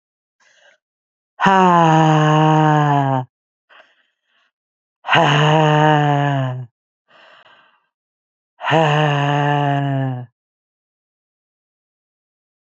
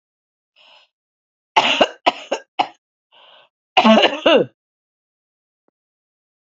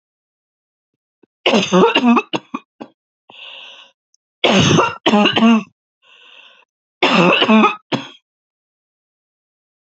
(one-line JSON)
{"exhalation_length": "12.8 s", "exhalation_amplitude": 28849, "exhalation_signal_mean_std_ratio": 0.5, "cough_length": "6.5 s", "cough_amplitude": 28407, "cough_signal_mean_std_ratio": 0.31, "three_cough_length": "9.8 s", "three_cough_amplitude": 30659, "three_cough_signal_mean_std_ratio": 0.44, "survey_phase": "alpha (2021-03-01 to 2021-08-12)", "age": "45-64", "gender": "Female", "wearing_mask": "No", "symptom_cough_any": true, "symptom_shortness_of_breath": true, "symptom_fatigue": true, "smoker_status": "Ex-smoker", "respiratory_condition_asthma": false, "respiratory_condition_other": false, "recruitment_source": "Test and Trace", "submission_delay": "1 day", "covid_test_result": "Positive", "covid_test_method": "RT-qPCR", "covid_ct_value": 23.8, "covid_ct_gene": "ORF1ab gene", "covid_ct_mean": 24.2, "covid_viral_load": "12000 copies/ml", "covid_viral_load_category": "Low viral load (10K-1M copies/ml)"}